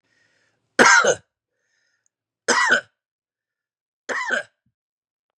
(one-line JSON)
{"three_cough_length": "5.4 s", "three_cough_amplitude": 32767, "three_cough_signal_mean_std_ratio": 0.32, "survey_phase": "beta (2021-08-13 to 2022-03-07)", "age": "45-64", "gender": "Male", "wearing_mask": "No", "symptom_none": true, "smoker_status": "Never smoked", "respiratory_condition_asthma": false, "respiratory_condition_other": false, "recruitment_source": "REACT", "submission_delay": "1 day", "covid_test_result": "Negative", "covid_test_method": "RT-qPCR", "influenza_a_test_result": "Negative", "influenza_b_test_result": "Negative"}